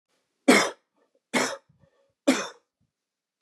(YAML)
three_cough_length: 3.4 s
three_cough_amplitude: 23177
three_cough_signal_mean_std_ratio: 0.3
survey_phase: beta (2021-08-13 to 2022-03-07)
age: 45-64
gender: Male
wearing_mask: 'No'
symptom_none: true
smoker_status: Never smoked
respiratory_condition_asthma: false
respiratory_condition_other: false
recruitment_source: REACT
submission_delay: 2 days
covid_test_result: Negative
covid_test_method: RT-qPCR
influenza_a_test_result: Negative
influenza_b_test_result: Negative